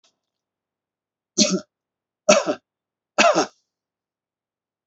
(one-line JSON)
{"three_cough_length": "4.9 s", "three_cough_amplitude": 26784, "three_cough_signal_mean_std_ratio": 0.28, "survey_phase": "beta (2021-08-13 to 2022-03-07)", "age": "45-64", "gender": "Male", "wearing_mask": "No", "symptom_none": true, "smoker_status": "Never smoked", "respiratory_condition_asthma": false, "respiratory_condition_other": false, "recruitment_source": "REACT", "submission_delay": "1 day", "covid_test_result": "Negative", "covid_test_method": "RT-qPCR", "influenza_a_test_result": "Negative", "influenza_b_test_result": "Negative"}